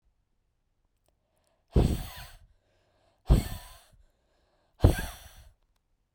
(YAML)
exhalation_length: 6.1 s
exhalation_amplitude: 18718
exhalation_signal_mean_std_ratio: 0.25
survey_phase: beta (2021-08-13 to 2022-03-07)
age: 18-44
gender: Female
wearing_mask: 'No'
symptom_cough_any: true
symptom_runny_or_blocked_nose: true
symptom_sore_throat: true
symptom_fatigue: true
symptom_headache: true
symptom_onset: 2 days
smoker_status: Ex-smoker
respiratory_condition_asthma: true
respiratory_condition_other: false
recruitment_source: Test and Trace
submission_delay: 1 day
covid_test_result: Positive
covid_test_method: RT-qPCR
covid_ct_value: 19.4
covid_ct_gene: ORF1ab gene
covid_ct_mean: 20.1
covid_viral_load: 260000 copies/ml
covid_viral_load_category: Low viral load (10K-1M copies/ml)